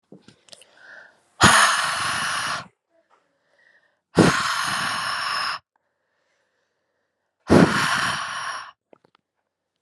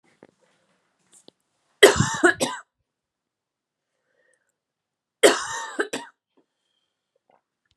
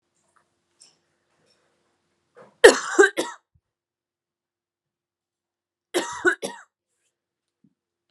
exhalation_length: 9.8 s
exhalation_amplitude: 32114
exhalation_signal_mean_std_ratio: 0.43
three_cough_length: 7.8 s
three_cough_amplitude: 32768
three_cough_signal_mean_std_ratio: 0.23
cough_length: 8.1 s
cough_amplitude: 32768
cough_signal_mean_std_ratio: 0.19
survey_phase: alpha (2021-03-01 to 2021-08-12)
age: 18-44
gender: Female
wearing_mask: 'No'
symptom_cough_any: true
symptom_new_continuous_cough: true
symptom_change_to_sense_of_smell_or_taste: true
symptom_loss_of_taste: true
smoker_status: Never smoked
respiratory_condition_asthma: false
respiratory_condition_other: false
recruitment_source: Test and Trace
submission_delay: 1 day
covid_test_result: Positive
covid_test_method: RT-qPCR
covid_ct_value: 22.9
covid_ct_gene: ORF1ab gene
covid_ct_mean: 24.3
covid_viral_load: 11000 copies/ml
covid_viral_load_category: Low viral load (10K-1M copies/ml)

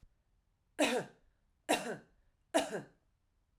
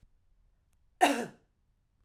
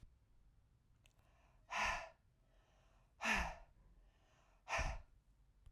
three_cough_length: 3.6 s
three_cough_amplitude: 4995
three_cough_signal_mean_std_ratio: 0.35
cough_length: 2.0 s
cough_amplitude: 9545
cough_signal_mean_std_ratio: 0.25
exhalation_length: 5.7 s
exhalation_amplitude: 2004
exhalation_signal_mean_std_ratio: 0.39
survey_phase: beta (2021-08-13 to 2022-03-07)
age: 45-64
gender: Female
wearing_mask: 'No'
symptom_none: true
smoker_status: Never smoked
respiratory_condition_asthma: false
respiratory_condition_other: false
recruitment_source: Test and Trace
submission_delay: 0 days
covid_test_result: Negative
covid_test_method: LFT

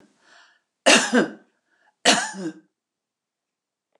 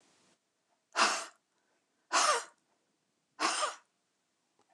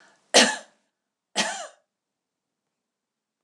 cough_length: 4.0 s
cough_amplitude: 28683
cough_signal_mean_std_ratio: 0.31
exhalation_length: 4.7 s
exhalation_amplitude: 6842
exhalation_signal_mean_std_ratio: 0.34
three_cough_length: 3.4 s
three_cough_amplitude: 25061
three_cough_signal_mean_std_ratio: 0.24
survey_phase: alpha (2021-03-01 to 2021-08-12)
age: 65+
gender: Female
wearing_mask: 'No'
symptom_none: true
smoker_status: Ex-smoker
respiratory_condition_asthma: false
respiratory_condition_other: false
recruitment_source: REACT
submission_delay: 4 days
covid_test_result: Negative
covid_test_method: RT-qPCR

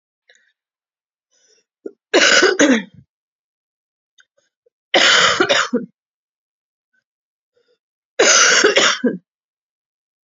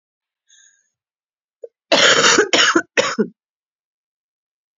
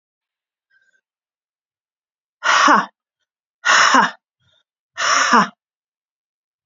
three_cough_length: 10.2 s
three_cough_amplitude: 32768
three_cough_signal_mean_std_ratio: 0.39
cough_length: 4.8 s
cough_amplitude: 32726
cough_signal_mean_std_ratio: 0.38
exhalation_length: 6.7 s
exhalation_amplitude: 32522
exhalation_signal_mean_std_ratio: 0.36
survey_phase: beta (2021-08-13 to 2022-03-07)
age: 18-44
gender: Female
wearing_mask: 'No'
symptom_cough_any: true
symptom_new_continuous_cough: true
symptom_runny_or_blocked_nose: true
symptom_shortness_of_breath: true
symptom_fever_high_temperature: true
symptom_headache: true
smoker_status: Ex-smoker
respiratory_condition_asthma: true
respiratory_condition_other: false
recruitment_source: Test and Trace
submission_delay: 2 days
covid_test_result: Positive
covid_test_method: RT-qPCR
covid_ct_value: 26.7
covid_ct_gene: ORF1ab gene
covid_ct_mean: 27.4
covid_viral_load: 1000 copies/ml
covid_viral_load_category: Minimal viral load (< 10K copies/ml)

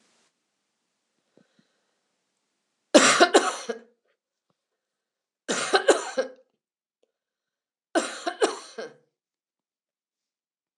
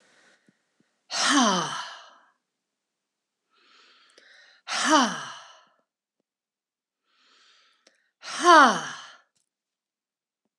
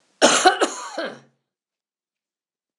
three_cough_length: 10.8 s
three_cough_amplitude: 25455
three_cough_signal_mean_std_ratio: 0.26
exhalation_length: 10.6 s
exhalation_amplitude: 23545
exhalation_signal_mean_std_ratio: 0.28
cough_length: 2.8 s
cough_amplitude: 26027
cough_signal_mean_std_ratio: 0.34
survey_phase: beta (2021-08-13 to 2022-03-07)
age: 65+
gender: Female
wearing_mask: 'No'
symptom_none: true
smoker_status: Never smoked
respiratory_condition_asthma: false
respiratory_condition_other: false
recruitment_source: REACT
submission_delay: 2 days
covid_test_result: Negative
covid_test_method: RT-qPCR
influenza_a_test_result: Negative
influenza_b_test_result: Negative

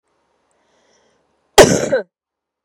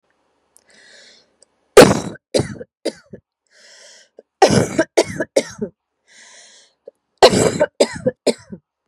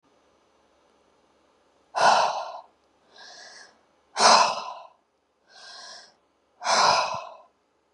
cough_length: 2.6 s
cough_amplitude: 32768
cough_signal_mean_std_ratio: 0.26
three_cough_length: 8.9 s
three_cough_amplitude: 32768
three_cough_signal_mean_std_ratio: 0.31
exhalation_length: 7.9 s
exhalation_amplitude: 21689
exhalation_signal_mean_std_ratio: 0.35
survey_phase: beta (2021-08-13 to 2022-03-07)
age: 18-44
gender: Female
wearing_mask: 'No'
symptom_cough_any: true
symptom_runny_or_blocked_nose: true
symptom_sore_throat: true
symptom_change_to_sense_of_smell_or_taste: true
symptom_loss_of_taste: true
smoker_status: Never smoked
respiratory_condition_asthma: false
respiratory_condition_other: false
recruitment_source: REACT
submission_delay: 2 days
covid_test_result: Negative
covid_test_method: RT-qPCR
influenza_a_test_result: Negative
influenza_b_test_result: Negative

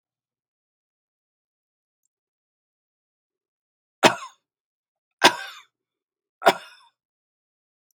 three_cough_length: 8.0 s
three_cough_amplitude: 32767
three_cough_signal_mean_std_ratio: 0.15
survey_phase: beta (2021-08-13 to 2022-03-07)
age: 65+
gender: Male
wearing_mask: 'No'
symptom_none: true
smoker_status: Ex-smoker
respiratory_condition_asthma: false
respiratory_condition_other: false
recruitment_source: REACT
submission_delay: 1 day
covid_test_result: Negative
covid_test_method: RT-qPCR
influenza_a_test_result: Negative
influenza_b_test_result: Negative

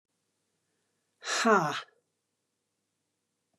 exhalation_length: 3.6 s
exhalation_amplitude: 10656
exhalation_signal_mean_std_ratio: 0.28
survey_phase: beta (2021-08-13 to 2022-03-07)
age: 65+
gender: Female
wearing_mask: 'No'
symptom_cough_any: true
symptom_headache: true
smoker_status: Never smoked
respiratory_condition_asthma: false
respiratory_condition_other: false
recruitment_source: REACT
submission_delay: 2 days
covid_test_result: Negative
covid_test_method: RT-qPCR
influenza_a_test_result: Negative
influenza_b_test_result: Negative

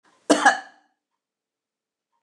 cough_length: 2.2 s
cough_amplitude: 27850
cough_signal_mean_std_ratio: 0.24
survey_phase: beta (2021-08-13 to 2022-03-07)
age: 65+
gender: Female
wearing_mask: 'No'
symptom_runny_or_blocked_nose: true
smoker_status: Never smoked
respiratory_condition_asthma: false
respiratory_condition_other: false
recruitment_source: Test and Trace
submission_delay: 1 day
covid_test_result: Negative
covid_test_method: LFT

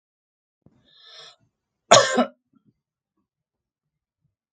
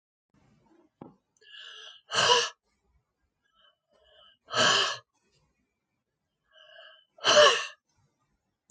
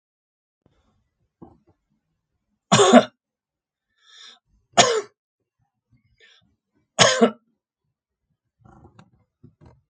cough_length: 4.5 s
cough_amplitude: 32767
cough_signal_mean_std_ratio: 0.19
exhalation_length: 8.7 s
exhalation_amplitude: 13939
exhalation_signal_mean_std_ratio: 0.29
three_cough_length: 9.9 s
three_cough_amplitude: 32767
three_cough_signal_mean_std_ratio: 0.22
survey_phase: beta (2021-08-13 to 2022-03-07)
age: 65+
gender: Male
wearing_mask: 'No'
symptom_none: true
smoker_status: Ex-smoker
respiratory_condition_asthma: false
respiratory_condition_other: false
recruitment_source: REACT
submission_delay: 2 days
covid_test_result: Negative
covid_test_method: RT-qPCR
influenza_a_test_result: Negative
influenza_b_test_result: Negative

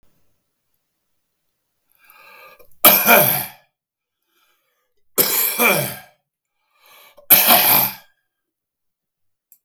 three_cough_length: 9.6 s
three_cough_amplitude: 32768
three_cough_signal_mean_std_ratio: 0.34
survey_phase: beta (2021-08-13 to 2022-03-07)
age: 65+
gender: Male
wearing_mask: 'No'
symptom_none: true
smoker_status: Never smoked
respiratory_condition_asthma: true
respiratory_condition_other: false
recruitment_source: REACT
submission_delay: 2 days
covid_test_result: Negative
covid_test_method: RT-qPCR
influenza_a_test_result: Negative
influenza_b_test_result: Negative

